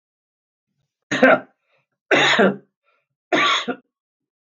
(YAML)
three_cough_length: 4.4 s
three_cough_amplitude: 32768
three_cough_signal_mean_std_ratio: 0.39
survey_phase: beta (2021-08-13 to 2022-03-07)
age: 45-64
gender: Male
wearing_mask: 'No'
symptom_none: true
smoker_status: Ex-smoker
respiratory_condition_asthma: false
respiratory_condition_other: false
recruitment_source: REACT
submission_delay: 3 days
covid_test_result: Negative
covid_test_method: RT-qPCR
influenza_a_test_result: Negative
influenza_b_test_result: Negative